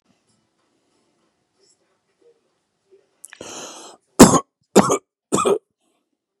cough_length: 6.4 s
cough_amplitude: 32768
cough_signal_mean_std_ratio: 0.22
survey_phase: beta (2021-08-13 to 2022-03-07)
age: 45-64
gender: Male
wearing_mask: 'No'
symptom_none: true
smoker_status: Ex-smoker
respiratory_condition_asthma: false
respiratory_condition_other: false
recruitment_source: REACT
submission_delay: 2 days
covid_test_result: Negative
covid_test_method: RT-qPCR
influenza_a_test_result: Negative
influenza_b_test_result: Negative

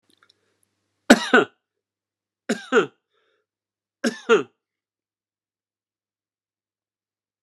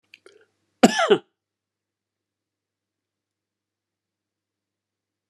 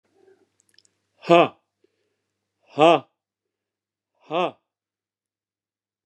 three_cough_length: 7.4 s
three_cough_amplitude: 29204
three_cough_signal_mean_std_ratio: 0.21
cough_length: 5.3 s
cough_amplitude: 29204
cough_signal_mean_std_ratio: 0.16
exhalation_length: 6.1 s
exhalation_amplitude: 26871
exhalation_signal_mean_std_ratio: 0.21
survey_phase: beta (2021-08-13 to 2022-03-07)
age: 65+
gender: Male
wearing_mask: 'No'
symptom_none: true
smoker_status: Never smoked
respiratory_condition_asthma: true
respiratory_condition_other: false
recruitment_source: REACT
submission_delay: 2 days
covid_test_result: Negative
covid_test_method: RT-qPCR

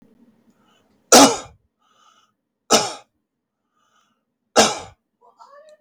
cough_length: 5.8 s
cough_amplitude: 32768
cough_signal_mean_std_ratio: 0.24
survey_phase: beta (2021-08-13 to 2022-03-07)
age: 65+
gender: Male
wearing_mask: 'No'
symptom_none: true
smoker_status: Never smoked
respiratory_condition_asthma: false
respiratory_condition_other: false
recruitment_source: REACT
submission_delay: 3 days
covid_test_result: Negative
covid_test_method: RT-qPCR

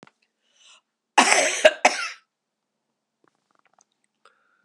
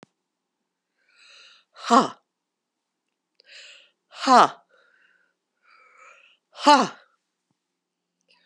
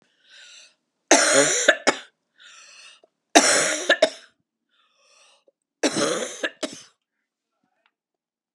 cough_length: 4.6 s
cough_amplitude: 32767
cough_signal_mean_std_ratio: 0.26
exhalation_length: 8.5 s
exhalation_amplitude: 26977
exhalation_signal_mean_std_ratio: 0.21
three_cough_length: 8.5 s
three_cough_amplitude: 32767
three_cough_signal_mean_std_ratio: 0.35
survey_phase: alpha (2021-03-01 to 2021-08-12)
age: 65+
gender: Female
wearing_mask: 'No'
symptom_cough_any: true
symptom_headache: true
smoker_status: Never smoked
respiratory_condition_asthma: false
respiratory_condition_other: false
recruitment_source: Test and Trace
submission_delay: 1 day
covid_test_result: Positive
covid_test_method: RT-qPCR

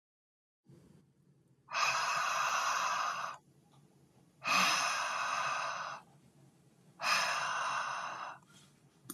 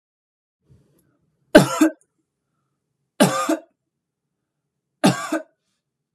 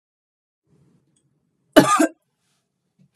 exhalation_length: 9.1 s
exhalation_amplitude: 4301
exhalation_signal_mean_std_ratio: 0.64
three_cough_length: 6.1 s
three_cough_amplitude: 32768
three_cough_signal_mean_std_ratio: 0.26
cough_length: 3.2 s
cough_amplitude: 32768
cough_signal_mean_std_ratio: 0.22
survey_phase: beta (2021-08-13 to 2022-03-07)
age: 18-44
gender: Female
wearing_mask: 'No'
symptom_none: true
smoker_status: Never smoked
respiratory_condition_asthma: false
respiratory_condition_other: false
recruitment_source: REACT
submission_delay: 2 days
covid_test_result: Negative
covid_test_method: RT-qPCR
influenza_a_test_result: Negative
influenza_b_test_result: Negative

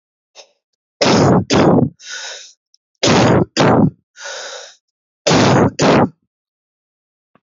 three_cough_length: 7.6 s
three_cough_amplitude: 32767
three_cough_signal_mean_std_ratio: 0.5
survey_phase: beta (2021-08-13 to 2022-03-07)
age: 18-44
gender: Male
wearing_mask: 'Yes'
symptom_cough_any: true
symptom_new_continuous_cough: true
symptom_runny_or_blocked_nose: true
symptom_sore_throat: true
symptom_abdominal_pain: true
symptom_fatigue: true
symptom_fever_high_temperature: true
symptom_headache: true
symptom_change_to_sense_of_smell_or_taste: true
symptom_loss_of_taste: true
symptom_other: true
symptom_onset: 3 days
smoker_status: Ex-smoker
respiratory_condition_asthma: false
respiratory_condition_other: false
recruitment_source: Test and Trace
submission_delay: 1 day
covid_test_result: Positive
covid_test_method: RT-qPCR
covid_ct_value: 15.4
covid_ct_gene: ORF1ab gene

